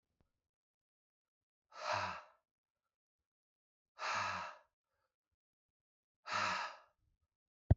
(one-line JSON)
{"exhalation_length": "7.8 s", "exhalation_amplitude": 4916, "exhalation_signal_mean_std_ratio": 0.28, "survey_phase": "beta (2021-08-13 to 2022-03-07)", "age": "65+", "gender": "Male", "wearing_mask": "No", "symptom_cough_any": true, "symptom_fatigue": true, "symptom_headache": true, "symptom_onset": "6 days", "smoker_status": "Never smoked", "respiratory_condition_asthma": false, "respiratory_condition_other": false, "recruitment_source": "Test and Trace", "submission_delay": "1 day", "covid_test_result": "Positive", "covid_test_method": "RT-qPCR"}